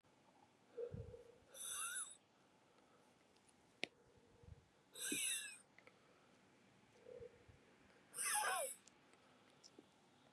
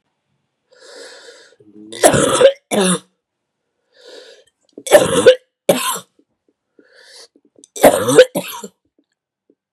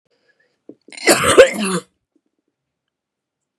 {"exhalation_length": "10.3 s", "exhalation_amplitude": 2359, "exhalation_signal_mean_std_ratio": 0.43, "three_cough_length": "9.7 s", "three_cough_amplitude": 32768, "three_cough_signal_mean_std_ratio": 0.34, "cough_length": "3.6 s", "cough_amplitude": 32768, "cough_signal_mean_std_ratio": 0.3, "survey_phase": "beta (2021-08-13 to 2022-03-07)", "age": "45-64", "gender": "Female", "wearing_mask": "No", "symptom_cough_any": true, "symptom_runny_or_blocked_nose": true, "symptom_shortness_of_breath": true, "symptom_sore_throat": true, "symptom_fatigue": true, "symptom_fever_high_temperature": true, "symptom_headache": true, "symptom_change_to_sense_of_smell_or_taste": true, "symptom_loss_of_taste": true, "symptom_other": true, "symptom_onset": "4 days", "smoker_status": "Ex-smoker", "respiratory_condition_asthma": true, "respiratory_condition_other": false, "recruitment_source": "Test and Trace", "submission_delay": "3 days", "covid_test_result": "Positive", "covid_test_method": "RT-qPCR"}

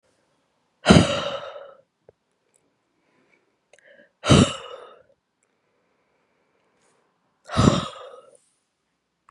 {"exhalation_length": "9.3 s", "exhalation_amplitude": 32768, "exhalation_signal_mean_std_ratio": 0.25, "survey_phase": "beta (2021-08-13 to 2022-03-07)", "age": "45-64", "gender": "Female", "wearing_mask": "No", "symptom_cough_any": true, "symptom_new_continuous_cough": true, "symptom_runny_or_blocked_nose": true, "symptom_sore_throat": true, "symptom_fatigue": true, "symptom_headache": true, "smoker_status": "Never smoked", "respiratory_condition_asthma": false, "respiratory_condition_other": false, "recruitment_source": "Test and Trace", "submission_delay": "2 days", "covid_test_result": "Positive", "covid_test_method": "LFT"}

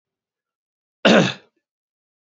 {"cough_length": "2.4 s", "cough_amplitude": 29793, "cough_signal_mean_std_ratio": 0.26, "survey_phase": "beta (2021-08-13 to 2022-03-07)", "age": "18-44", "gender": "Male", "wearing_mask": "No", "symptom_fatigue": true, "symptom_onset": "2 days", "smoker_status": "Never smoked", "respiratory_condition_asthma": false, "respiratory_condition_other": false, "recruitment_source": "Test and Trace", "submission_delay": "1 day", "covid_test_result": "Positive", "covid_test_method": "ePCR"}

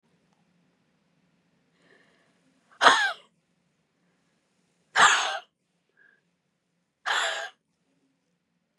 {"exhalation_length": "8.8 s", "exhalation_amplitude": 32078, "exhalation_signal_mean_std_ratio": 0.25, "survey_phase": "beta (2021-08-13 to 2022-03-07)", "age": "45-64", "gender": "Female", "wearing_mask": "Yes", "symptom_none": true, "smoker_status": "Never smoked", "respiratory_condition_asthma": true, "respiratory_condition_other": false, "recruitment_source": "REACT", "submission_delay": "4 days", "covid_test_result": "Negative", "covid_test_method": "RT-qPCR", "influenza_a_test_result": "Negative", "influenza_b_test_result": "Negative"}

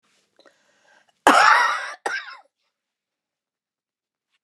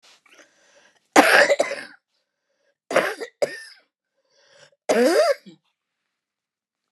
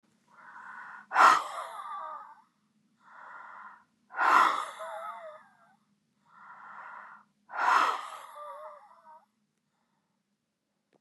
{"cough_length": "4.4 s", "cough_amplitude": 29203, "cough_signal_mean_std_ratio": 0.3, "three_cough_length": "6.9 s", "three_cough_amplitude": 29204, "three_cough_signal_mean_std_ratio": 0.34, "exhalation_length": "11.0 s", "exhalation_amplitude": 16174, "exhalation_signal_mean_std_ratio": 0.34, "survey_phase": "beta (2021-08-13 to 2022-03-07)", "age": "65+", "gender": "Female", "wearing_mask": "No", "symptom_cough_any": true, "symptom_fatigue": true, "smoker_status": "Ex-smoker", "respiratory_condition_asthma": true, "respiratory_condition_other": true, "recruitment_source": "REACT", "submission_delay": "1 day", "covid_test_result": "Negative", "covid_test_method": "RT-qPCR"}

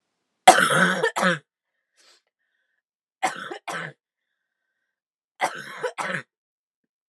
{"three_cough_length": "7.1 s", "three_cough_amplitude": 32768, "three_cough_signal_mean_std_ratio": 0.3, "survey_phase": "alpha (2021-03-01 to 2021-08-12)", "age": "18-44", "gender": "Female", "wearing_mask": "No", "symptom_cough_any": true, "symptom_headache": true, "smoker_status": "Never smoked", "respiratory_condition_asthma": false, "respiratory_condition_other": false, "recruitment_source": "Test and Trace", "submission_delay": "1 day", "covid_test_result": "Positive", "covid_test_method": "RT-qPCR"}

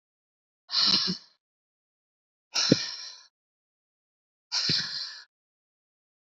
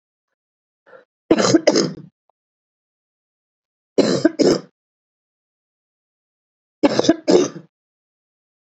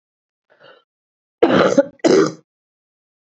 {"exhalation_length": "6.3 s", "exhalation_amplitude": 25095, "exhalation_signal_mean_std_ratio": 0.35, "three_cough_length": "8.6 s", "three_cough_amplitude": 32768, "three_cough_signal_mean_std_ratio": 0.31, "cough_length": "3.3 s", "cough_amplitude": 32767, "cough_signal_mean_std_ratio": 0.36, "survey_phase": "beta (2021-08-13 to 2022-03-07)", "age": "45-64", "gender": "Female", "wearing_mask": "No", "symptom_new_continuous_cough": true, "symptom_runny_or_blocked_nose": true, "symptom_shortness_of_breath": true, "symptom_fatigue": true, "symptom_onset": "5 days", "smoker_status": "Ex-smoker", "respiratory_condition_asthma": false, "respiratory_condition_other": false, "recruitment_source": "Test and Trace", "submission_delay": "3 days", "covid_test_result": "Positive", "covid_test_method": "RT-qPCR"}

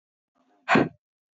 {"exhalation_length": "1.4 s", "exhalation_amplitude": 13555, "exhalation_signal_mean_std_ratio": 0.29, "survey_phase": "alpha (2021-03-01 to 2021-08-12)", "age": "18-44", "gender": "Female", "wearing_mask": "No", "symptom_none": true, "smoker_status": "Never smoked", "respiratory_condition_asthma": false, "respiratory_condition_other": false, "recruitment_source": "REACT", "submission_delay": "1 day", "covid_test_result": "Negative", "covid_test_method": "RT-qPCR"}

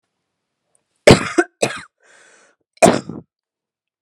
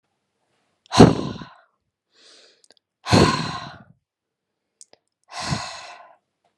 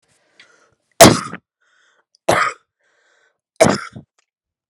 {"cough_length": "4.0 s", "cough_amplitude": 32768, "cough_signal_mean_std_ratio": 0.25, "exhalation_length": "6.6 s", "exhalation_amplitude": 32768, "exhalation_signal_mean_std_ratio": 0.26, "three_cough_length": "4.7 s", "three_cough_amplitude": 32768, "three_cough_signal_mean_std_ratio": 0.25, "survey_phase": "alpha (2021-03-01 to 2021-08-12)", "age": "18-44", "gender": "Female", "wearing_mask": "No", "symptom_none": true, "smoker_status": "Prefer not to say", "respiratory_condition_asthma": false, "respiratory_condition_other": false, "recruitment_source": "REACT", "submission_delay": "1 day", "covid_test_result": "Negative", "covid_test_method": "RT-qPCR"}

